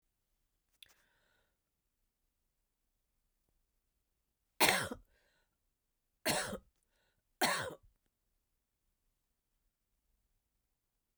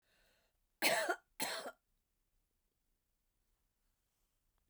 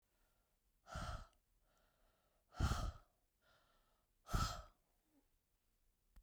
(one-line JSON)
{"three_cough_length": "11.2 s", "three_cough_amplitude": 8368, "three_cough_signal_mean_std_ratio": 0.21, "cough_length": "4.7 s", "cough_amplitude": 3694, "cough_signal_mean_std_ratio": 0.27, "exhalation_length": "6.2 s", "exhalation_amplitude": 1625, "exhalation_signal_mean_std_ratio": 0.31, "survey_phase": "beta (2021-08-13 to 2022-03-07)", "age": "65+", "gender": "Female", "wearing_mask": "No", "symptom_cough_any": true, "symptom_fatigue": true, "symptom_onset": "3 days", "smoker_status": "Never smoked", "respiratory_condition_asthma": false, "respiratory_condition_other": false, "recruitment_source": "Test and Trace", "submission_delay": "1 day", "covid_test_result": "Positive", "covid_test_method": "ePCR"}